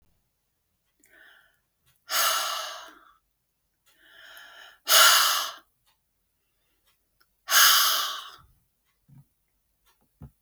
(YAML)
exhalation_length: 10.4 s
exhalation_amplitude: 20721
exhalation_signal_mean_std_ratio: 0.32
survey_phase: beta (2021-08-13 to 2022-03-07)
age: 65+
gender: Female
wearing_mask: 'No'
symptom_none: true
smoker_status: Never smoked
respiratory_condition_asthma: false
respiratory_condition_other: false
recruitment_source: REACT
submission_delay: 4 days
covid_test_result: Negative
covid_test_method: RT-qPCR
influenza_a_test_result: Negative
influenza_b_test_result: Negative